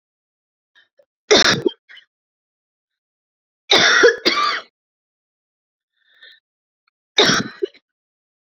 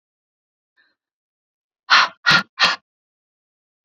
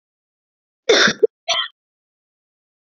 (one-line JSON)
{"three_cough_length": "8.5 s", "three_cough_amplitude": 30834, "three_cough_signal_mean_std_ratio": 0.32, "exhalation_length": "3.8 s", "exhalation_amplitude": 29320, "exhalation_signal_mean_std_ratio": 0.27, "cough_length": "2.9 s", "cough_amplitude": 28381, "cough_signal_mean_std_ratio": 0.3, "survey_phase": "beta (2021-08-13 to 2022-03-07)", "age": "18-44", "gender": "Female", "wearing_mask": "No", "symptom_cough_any": true, "symptom_shortness_of_breath": true, "symptom_fatigue": true, "symptom_fever_high_temperature": true, "smoker_status": "Current smoker (1 to 10 cigarettes per day)", "respiratory_condition_asthma": false, "respiratory_condition_other": false, "recruitment_source": "Test and Trace", "submission_delay": "2 days", "covid_test_result": "Positive", "covid_test_method": "RT-qPCR", "covid_ct_value": 21.3, "covid_ct_gene": "ORF1ab gene", "covid_ct_mean": 22.0, "covid_viral_load": "61000 copies/ml", "covid_viral_load_category": "Low viral load (10K-1M copies/ml)"}